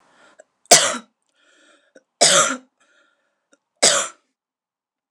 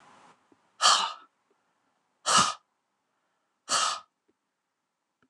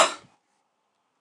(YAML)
three_cough_length: 5.1 s
three_cough_amplitude: 29204
three_cough_signal_mean_std_ratio: 0.3
exhalation_length: 5.3 s
exhalation_amplitude: 16569
exhalation_signal_mean_std_ratio: 0.31
cough_length: 1.2 s
cough_amplitude: 19386
cough_signal_mean_std_ratio: 0.23
survey_phase: beta (2021-08-13 to 2022-03-07)
age: 45-64
gender: Female
wearing_mask: 'No'
symptom_none: true
smoker_status: Prefer not to say
respiratory_condition_asthma: false
respiratory_condition_other: false
recruitment_source: REACT
submission_delay: 1 day
covid_test_result: Negative
covid_test_method: RT-qPCR
influenza_a_test_result: Negative
influenza_b_test_result: Negative